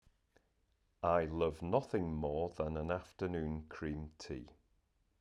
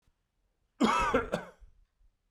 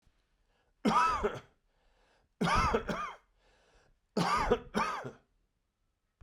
{
  "exhalation_length": "5.2 s",
  "exhalation_amplitude": 3963,
  "exhalation_signal_mean_std_ratio": 0.58,
  "cough_length": "2.3 s",
  "cough_amplitude": 6730,
  "cough_signal_mean_std_ratio": 0.4,
  "three_cough_length": "6.2 s",
  "three_cough_amplitude": 7410,
  "three_cough_signal_mean_std_ratio": 0.46,
  "survey_phase": "beta (2021-08-13 to 2022-03-07)",
  "age": "45-64",
  "gender": "Male",
  "wearing_mask": "No",
  "symptom_none": true,
  "smoker_status": "Never smoked",
  "respiratory_condition_asthma": false,
  "respiratory_condition_other": false,
  "recruitment_source": "REACT",
  "submission_delay": "1 day",
  "covid_test_result": "Negative",
  "covid_test_method": "RT-qPCR"
}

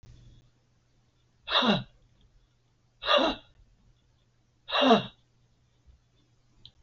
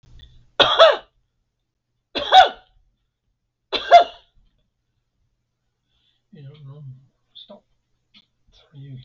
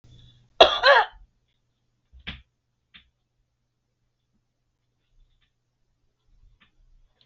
{
  "exhalation_length": "6.8 s",
  "exhalation_amplitude": 13119,
  "exhalation_signal_mean_std_ratio": 0.3,
  "three_cough_length": "9.0 s",
  "three_cough_amplitude": 32768,
  "three_cough_signal_mean_std_ratio": 0.24,
  "cough_length": "7.3 s",
  "cough_amplitude": 32768,
  "cough_signal_mean_std_ratio": 0.18,
  "survey_phase": "beta (2021-08-13 to 2022-03-07)",
  "age": "65+",
  "gender": "Female",
  "wearing_mask": "No",
  "symptom_cough_any": true,
  "symptom_runny_or_blocked_nose": true,
  "smoker_status": "Never smoked",
  "respiratory_condition_asthma": true,
  "respiratory_condition_other": true,
  "recruitment_source": "REACT",
  "submission_delay": "9 days",
  "covid_test_result": "Negative",
  "covid_test_method": "RT-qPCR",
  "influenza_a_test_result": "Negative",
  "influenza_b_test_result": "Negative"
}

